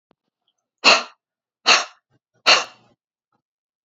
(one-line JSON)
{"exhalation_length": "3.8 s", "exhalation_amplitude": 32767, "exhalation_signal_mean_std_ratio": 0.27, "survey_phase": "beta (2021-08-13 to 2022-03-07)", "age": "45-64", "gender": "Female", "wearing_mask": "No", "symptom_runny_or_blocked_nose": true, "smoker_status": "Never smoked", "respiratory_condition_asthma": false, "respiratory_condition_other": false, "recruitment_source": "REACT", "submission_delay": "1 day", "covid_test_result": "Negative", "covid_test_method": "RT-qPCR"}